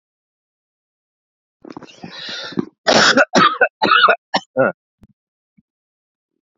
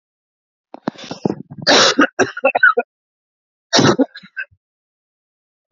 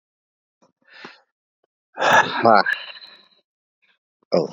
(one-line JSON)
{"three_cough_length": "6.6 s", "three_cough_amplitude": 31466, "three_cough_signal_mean_std_ratio": 0.36, "cough_length": "5.7 s", "cough_amplitude": 31438, "cough_signal_mean_std_ratio": 0.37, "exhalation_length": "4.5 s", "exhalation_amplitude": 27814, "exhalation_signal_mean_std_ratio": 0.32, "survey_phase": "beta (2021-08-13 to 2022-03-07)", "age": "18-44", "gender": "Male", "wearing_mask": "No", "symptom_cough_any": true, "smoker_status": "Current smoker (11 or more cigarettes per day)", "respiratory_condition_asthma": false, "respiratory_condition_other": false, "recruitment_source": "REACT", "submission_delay": "1 day", "covid_test_result": "Negative", "covid_test_method": "RT-qPCR"}